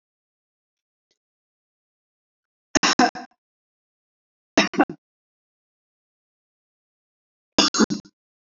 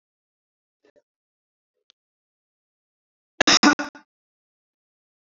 three_cough_length: 8.4 s
three_cough_amplitude: 27045
three_cough_signal_mean_std_ratio: 0.21
cough_length: 5.2 s
cough_amplitude: 26916
cough_signal_mean_std_ratio: 0.17
survey_phase: beta (2021-08-13 to 2022-03-07)
age: 45-64
gender: Female
wearing_mask: 'No'
symptom_none: true
smoker_status: Never smoked
respiratory_condition_asthma: false
respiratory_condition_other: false
recruitment_source: REACT
submission_delay: 2 days
covid_test_result: Negative
covid_test_method: RT-qPCR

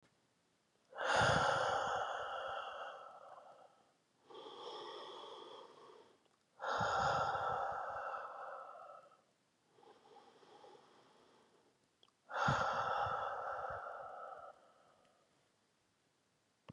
exhalation_length: 16.7 s
exhalation_amplitude: 2826
exhalation_signal_mean_std_ratio: 0.53
survey_phase: beta (2021-08-13 to 2022-03-07)
age: 18-44
gender: Male
wearing_mask: 'No'
symptom_cough_any: true
symptom_new_continuous_cough: true
symptom_runny_or_blocked_nose: true
symptom_fatigue: true
symptom_fever_high_temperature: true
symptom_change_to_sense_of_smell_or_taste: true
symptom_onset: 4 days
smoker_status: Never smoked
respiratory_condition_asthma: false
respiratory_condition_other: false
recruitment_source: Test and Trace
submission_delay: 2 days
covid_test_result: Positive
covid_test_method: RT-qPCR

